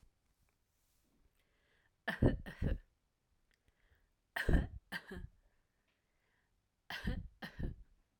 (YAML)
three_cough_length: 8.2 s
three_cough_amplitude: 4063
three_cough_signal_mean_std_ratio: 0.3
survey_phase: alpha (2021-03-01 to 2021-08-12)
age: 18-44
gender: Female
wearing_mask: 'No'
symptom_none: true
smoker_status: Never smoked
respiratory_condition_asthma: false
respiratory_condition_other: false
recruitment_source: REACT
submission_delay: 1 day
covid_test_result: Negative
covid_test_method: RT-qPCR